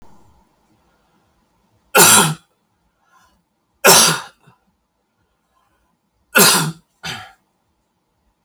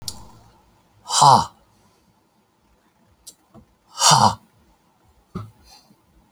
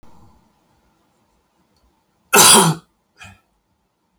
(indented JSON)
{
  "three_cough_length": "8.4 s",
  "three_cough_amplitude": 32768,
  "three_cough_signal_mean_std_ratio": 0.29,
  "exhalation_length": "6.3 s",
  "exhalation_amplitude": 32075,
  "exhalation_signal_mean_std_ratio": 0.27,
  "cough_length": "4.2 s",
  "cough_amplitude": 32768,
  "cough_signal_mean_std_ratio": 0.26,
  "survey_phase": "beta (2021-08-13 to 2022-03-07)",
  "age": "65+",
  "gender": "Male",
  "wearing_mask": "No",
  "symptom_cough_any": true,
  "symptom_runny_or_blocked_nose": true,
  "symptom_sore_throat": true,
  "symptom_fatigue": true,
  "symptom_fever_high_temperature": true,
  "symptom_headache": true,
  "smoker_status": "Never smoked",
  "respiratory_condition_asthma": true,
  "respiratory_condition_other": false,
  "recruitment_source": "Test and Trace",
  "submission_delay": "2 days",
  "covid_test_result": "Positive",
  "covid_test_method": "RT-qPCR",
  "covid_ct_value": 17.2,
  "covid_ct_gene": "N gene",
  "covid_ct_mean": 17.4,
  "covid_viral_load": "2000000 copies/ml",
  "covid_viral_load_category": "High viral load (>1M copies/ml)"
}